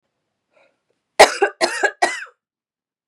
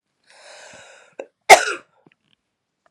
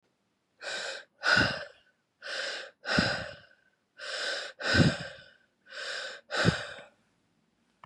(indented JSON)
{
  "three_cough_length": "3.1 s",
  "three_cough_amplitude": 32768,
  "three_cough_signal_mean_std_ratio": 0.29,
  "cough_length": "2.9 s",
  "cough_amplitude": 32768,
  "cough_signal_mean_std_ratio": 0.18,
  "exhalation_length": "7.9 s",
  "exhalation_amplitude": 10186,
  "exhalation_signal_mean_std_ratio": 0.46,
  "survey_phase": "beta (2021-08-13 to 2022-03-07)",
  "age": "45-64",
  "gender": "Female",
  "wearing_mask": "No",
  "symptom_cough_any": true,
  "symptom_runny_or_blocked_nose": true,
  "symptom_change_to_sense_of_smell_or_taste": true,
  "symptom_loss_of_taste": true,
  "smoker_status": "Ex-smoker",
  "respiratory_condition_asthma": false,
  "respiratory_condition_other": false,
  "recruitment_source": "Test and Trace",
  "submission_delay": "1 day",
  "covid_test_result": "Positive",
  "covid_test_method": "LFT"
}